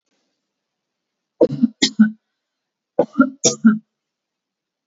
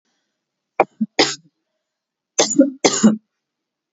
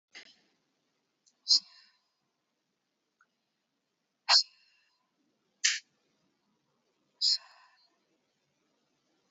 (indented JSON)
{
  "three_cough_length": "4.9 s",
  "three_cough_amplitude": 30546,
  "three_cough_signal_mean_std_ratio": 0.29,
  "cough_length": "3.9 s",
  "cough_amplitude": 32768,
  "cough_signal_mean_std_ratio": 0.33,
  "exhalation_length": "9.3 s",
  "exhalation_amplitude": 12412,
  "exhalation_signal_mean_std_ratio": 0.19,
  "survey_phase": "beta (2021-08-13 to 2022-03-07)",
  "age": "18-44",
  "gender": "Female",
  "wearing_mask": "No",
  "symptom_cough_any": true,
  "symptom_runny_or_blocked_nose": true,
  "symptom_shortness_of_breath": true,
  "symptom_sore_throat": true,
  "symptom_headache": true,
  "smoker_status": "Never smoked",
  "respiratory_condition_asthma": false,
  "respiratory_condition_other": false,
  "recruitment_source": "Test and Trace",
  "submission_delay": "0 days",
  "covid_test_result": "Positive",
  "covid_test_method": "RT-qPCR",
  "covid_ct_value": 18.3,
  "covid_ct_gene": "ORF1ab gene",
  "covid_ct_mean": 18.4,
  "covid_viral_load": "950000 copies/ml",
  "covid_viral_load_category": "Low viral load (10K-1M copies/ml)"
}